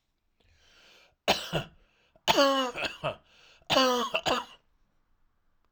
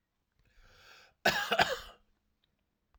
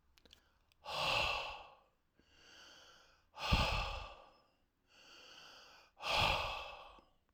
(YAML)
three_cough_length: 5.7 s
three_cough_amplitude: 11866
three_cough_signal_mean_std_ratio: 0.41
cough_length: 3.0 s
cough_amplitude: 9348
cough_signal_mean_std_ratio: 0.3
exhalation_length: 7.3 s
exhalation_amplitude: 4390
exhalation_signal_mean_std_ratio: 0.45
survey_phase: alpha (2021-03-01 to 2021-08-12)
age: 45-64
gender: Male
wearing_mask: 'No'
symptom_none: true
symptom_onset: 3 days
smoker_status: Never smoked
respiratory_condition_asthma: false
respiratory_condition_other: false
recruitment_source: REACT
submission_delay: 1 day
covid_test_result: Negative
covid_test_method: RT-qPCR